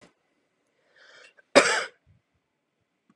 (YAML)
cough_length: 3.2 s
cough_amplitude: 30995
cough_signal_mean_std_ratio: 0.21
survey_phase: beta (2021-08-13 to 2022-03-07)
age: 18-44
gender: Female
wearing_mask: 'No'
symptom_fatigue: true
symptom_onset: 13 days
smoker_status: Never smoked
respiratory_condition_asthma: false
respiratory_condition_other: false
recruitment_source: REACT
submission_delay: 2 days
covid_test_result: Negative
covid_test_method: RT-qPCR
influenza_a_test_result: Negative
influenza_b_test_result: Negative